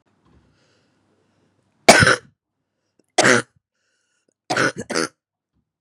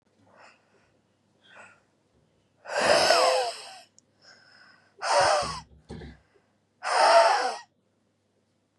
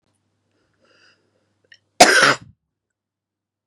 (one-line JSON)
{"three_cough_length": "5.8 s", "three_cough_amplitude": 32768, "three_cough_signal_mean_std_ratio": 0.27, "exhalation_length": "8.8 s", "exhalation_amplitude": 20211, "exhalation_signal_mean_std_ratio": 0.4, "cough_length": "3.7 s", "cough_amplitude": 32768, "cough_signal_mean_std_ratio": 0.23, "survey_phase": "beta (2021-08-13 to 2022-03-07)", "age": "18-44", "gender": "Female", "wearing_mask": "No", "symptom_none": true, "smoker_status": "Current smoker (11 or more cigarettes per day)", "respiratory_condition_asthma": true, "respiratory_condition_other": true, "recruitment_source": "REACT", "submission_delay": "2 days", "covid_test_result": "Negative", "covid_test_method": "RT-qPCR", "influenza_a_test_result": "Negative", "influenza_b_test_result": "Negative"}